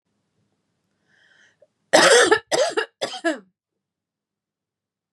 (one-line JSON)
{"cough_length": "5.1 s", "cough_amplitude": 30846, "cough_signal_mean_std_ratio": 0.32, "survey_phase": "beta (2021-08-13 to 2022-03-07)", "age": "18-44", "gender": "Female", "wearing_mask": "No", "symptom_sore_throat": true, "smoker_status": "Never smoked", "respiratory_condition_asthma": false, "respiratory_condition_other": false, "recruitment_source": "Test and Trace", "submission_delay": "2 days", "covid_test_result": "Positive", "covid_test_method": "RT-qPCR", "covid_ct_value": 26.1, "covid_ct_gene": "N gene"}